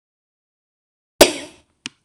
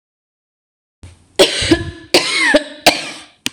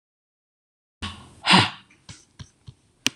{"cough_length": "2.0 s", "cough_amplitude": 26028, "cough_signal_mean_std_ratio": 0.18, "three_cough_length": "3.5 s", "three_cough_amplitude": 26028, "three_cough_signal_mean_std_ratio": 0.44, "exhalation_length": "3.2 s", "exhalation_amplitude": 26028, "exhalation_signal_mean_std_ratio": 0.25, "survey_phase": "beta (2021-08-13 to 2022-03-07)", "age": "45-64", "gender": "Female", "wearing_mask": "No", "symptom_cough_any": true, "symptom_runny_or_blocked_nose": true, "symptom_shortness_of_breath": true, "symptom_headache": true, "symptom_change_to_sense_of_smell_or_taste": true, "symptom_loss_of_taste": true, "symptom_onset": "6 days", "smoker_status": "Ex-smoker", "respiratory_condition_asthma": false, "respiratory_condition_other": false, "recruitment_source": "Test and Trace", "submission_delay": "0 days", "covid_test_result": "Positive", "covid_test_method": "ePCR"}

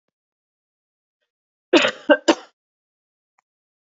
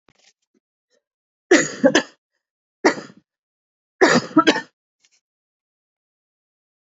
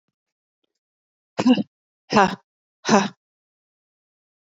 {"cough_length": "3.9 s", "cough_amplitude": 27103, "cough_signal_mean_std_ratio": 0.21, "three_cough_length": "6.9 s", "three_cough_amplitude": 28208, "three_cough_signal_mean_std_ratio": 0.27, "exhalation_length": "4.4 s", "exhalation_amplitude": 28203, "exhalation_signal_mean_std_ratio": 0.27, "survey_phase": "beta (2021-08-13 to 2022-03-07)", "age": "18-44", "gender": "Female", "wearing_mask": "No", "symptom_cough_any": true, "symptom_runny_or_blocked_nose": true, "symptom_headache": true, "symptom_other": true, "symptom_onset": "7 days", "smoker_status": "Ex-smoker", "respiratory_condition_asthma": false, "respiratory_condition_other": false, "recruitment_source": "Test and Trace", "submission_delay": "3 days", "covid_test_result": "Positive", "covid_test_method": "RT-qPCR"}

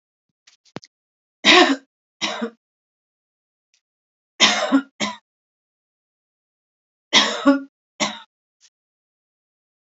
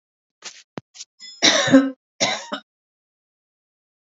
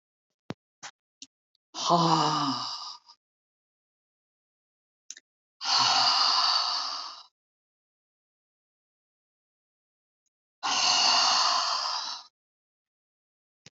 {"three_cough_length": "9.9 s", "three_cough_amplitude": 32768, "three_cough_signal_mean_std_ratio": 0.28, "cough_length": "4.2 s", "cough_amplitude": 32768, "cough_signal_mean_std_ratio": 0.31, "exhalation_length": "13.7 s", "exhalation_amplitude": 11788, "exhalation_signal_mean_std_ratio": 0.44, "survey_phase": "alpha (2021-03-01 to 2021-08-12)", "age": "65+", "gender": "Female", "wearing_mask": "No", "symptom_none": true, "symptom_onset": "13 days", "smoker_status": "Never smoked", "respiratory_condition_asthma": false, "respiratory_condition_other": false, "recruitment_source": "REACT", "submission_delay": "1 day", "covid_test_result": "Negative", "covid_test_method": "RT-qPCR"}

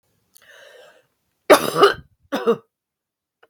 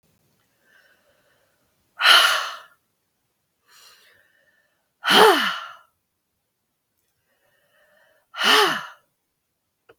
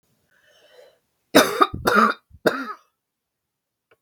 {"cough_length": "3.5 s", "cough_amplitude": 32768, "cough_signal_mean_std_ratio": 0.28, "exhalation_length": "10.0 s", "exhalation_amplitude": 32768, "exhalation_signal_mean_std_ratio": 0.29, "three_cough_length": "4.0 s", "three_cough_amplitude": 32768, "three_cough_signal_mean_std_ratio": 0.32, "survey_phase": "beta (2021-08-13 to 2022-03-07)", "age": "45-64", "gender": "Female", "wearing_mask": "No", "symptom_none": true, "smoker_status": "Never smoked", "respiratory_condition_asthma": true, "respiratory_condition_other": false, "recruitment_source": "REACT", "submission_delay": "4 days", "covid_test_result": "Negative", "covid_test_method": "RT-qPCR", "influenza_a_test_result": "Unknown/Void", "influenza_b_test_result": "Unknown/Void"}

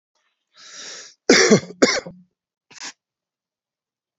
{"cough_length": "4.2 s", "cough_amplitude": 31710, "cough_signal_mean_std_ratio": 0.28, "survey_phase": "beta (2021-08-13 to 2022-03-07)", "age": "65+", "gender": "Male", "wearing_mask": "No", "symptom_none": true, "smoker_status": "Ex-smoker", "respiratory_condition_asthma": false, "respiratory_condition_other": false, "recruitment_source": "REACT", "submission_delay": "5 days", "covid_test_result": "Negative", "covid_test_method": "RT-qPCR"}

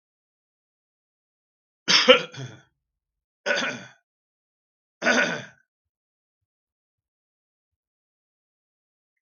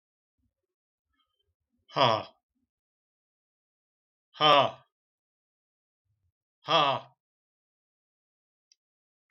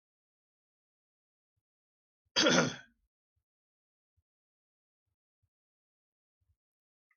{"three_cough_length": "9.2 s", "three_cough_amplitude": 32492, "three_cough_signal_mean_std_ratio": 0.23, "exhalation_length": "9.3 s", "exhalation_amplitude": 13760, "exhalation_signal_mean_std_ratio": 0.22, "cough_length": "7.2 s", "cough_amplitude": 7887, "cough_signal_mean_std_ratio": 0.17, "survey_phase": "beta (2021-08-13 to 2022-03-07)", "age": "65+", "gender": "Male", "wearing_mask": "No", "symptom_none": true, "smoker_status": "Never smoked", "respiratory_condition_asthma": false, "respiratory_condition_other": false, "recruitment_source": "REACT", "submission_delay": "3 days", "covid_test_result": "Negative", "covid_test_method": "RT-qPCR"}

